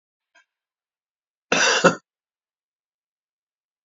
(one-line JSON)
{"cough_length": "3.8 s", "cough_amplitude": 27997, "cough_signal_mean_std_ratio": 0.24, "survey_phase": "beta (2021-08-13 to 2022-03-07)", "age": "65+", "gender": "Male", "wearing_mask": "No", "symptom_cough_any": true, "symptom_runny_or_blocked_nose": true, "smoker_status": "Never smoked", "respiratory_condition_asthma": true, "respiratory_condition_other": false, "recruitment_source": "REACT", "submission_delay": "1 day", "covid_test_result": "Negative", "covid_test_method": "RT-qPCR", "influenza_a_test_result": "Negative", "influenza_b_test_result": "Negative"}